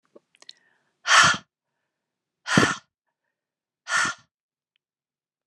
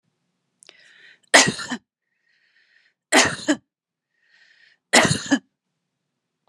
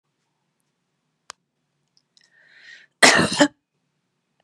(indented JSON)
{
  "exhalation_length": "5.5 s",
  "exhalation_amplitude": 23970,
  "exhalation_signal_mean_std_ratio": 0.28,
  "three_cough_length": "6.5 s",
  "three_cough_amplitude": 32768,
  "three_cough_signal_mean_std_ratio": 0.28,
  "cough_length": "4.4 s",
  "cough_amplitude": 32767,
  "cough_signal_mean_std_ratio": 0.23,
  "survey_phase": "beta (2021-08-13 to 2022-03-07)",
  "age": "45-64",
  "gender": "Female",
  "wearing_mask": "No",
  "symptom_cough_any": true,
  "symptom_abdominal_pain": true,
  "symptom_diarrhoea": true,
  "symptom_fatigue": true,
  "symptom_change_to_sense_of_smell_or_taste": true,
  "symptom_onset": "7 days",
  "smoker_status": "Never smoked",
  "respiratory_condition_asthma": false,
  "respiratory_condition_other": false,
  "recruitment_source": "Test and Trace",
  "submission_delay": "1 day",
  "covid_test_result": "Positive",
  "covid_test_method": "RT-qPCR"
}